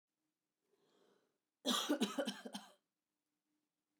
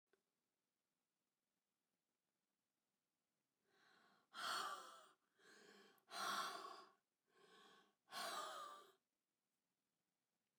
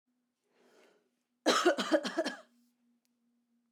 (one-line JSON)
{"cough_length": "4.0 s", "cough_amplitude": 2262, "cough_signal_mean_std_ratio": 0.33, "exhalation_length": "10.6 s", "exhalation_amplitude": 590, "exhalation_signal_mean_std_ratio": 0.37, "three_cough_length": "3.7 s", "three_cough_amplitude": 6729, "three_cough_signal_mean_std_ratio": 0.34, "survey_phase": "beta (2021-08-13 to 2022-03-07)", "age": "45-64", "gender": "Female", "wearing_mask": "No", "symptom_none": true, "smoker_status": "Ex-smoker", "respiratory_condition_asthma": true, "respiratory_condition_other": false, "recruitment_source": "REACT", "submission_delay": "1 day", "covid_test_result": "Negative", "covid_test_method": "RT-qPCR", "influenza_a_test_result": "Negative", "influenza_b_test_result": "Negative"}